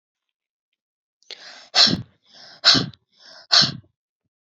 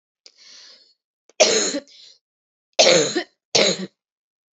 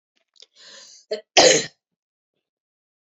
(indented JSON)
{
  "exhalation_length": "4.5 s",
  "exhalation_amplitude": 32114,
  "exhalation_signal_mean_std_ratio": 0.3,
  "three_cough_length": "4.5 s",
  "three_cough_amplitude": 31199,
  "three_cough_signal_mean_std_ratio": 0.37,
  "cough_length": "3.2 s",
  "cough_amplitude": 28259,
  "cough_signal_mean_std_ratio": 0.25,
  "survey_phase": "beta (2021-08-13 to 2022-03-07)",
  "age": "18-44",
  "gender": "Female",
  "wearing_mask": "No",
  "symptom_cough_any": true,
  "symptom_runny_or_blocked_nose": true,
  "symptom_sore_throat": true,
  "symptom_fatigue": true,
  "symptom_fever_high_temperature": true,
  "symptom_onset": "3 days",
  "smoker_status": "Prefer not to say",
  "respiratory_condition_asthma": false,
  "respiratory_condition_other": false,
  "recruitment_source": "Test and Trace",
  "submission_delay": "2 days",
  "covid_test_result": "Positive",
  "covid_test_method": "RT-qPCR",
  "covid_ct_value": 16.0,
  "covid_ct_gene": "ORF1ab gene",
  "covid_ct_mean": 16.1,
  "covid_viral_load": "5100000 copies/ml",
  "covid_viral_load_category": "High viral load (>1M copies/ml)"
}